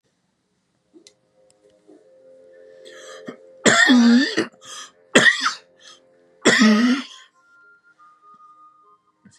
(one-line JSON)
{"three_cough_length": "9.4 s", "three_cough_amplitude": 32524, "three_cough_signal_mean_std_ratio": 0.37, "survey_phase": "beta (2021-08-13 to 2022-03-07)", "age": "65+", "gender": "Male", "wearing_mask": "No", "symptom_none": true, "smoker_status": "Never smoked", "respiratory_condition_asthma": false, "respiratory_condition_other": false, "recruitment_source": "REACT", "submission_delay": "2 days", "covid_test_result": "Negative", "covid_test_method": "RT-qPCR", "influenza_a_test_result": "Negative", "influenza_b_test_result": "Negative"}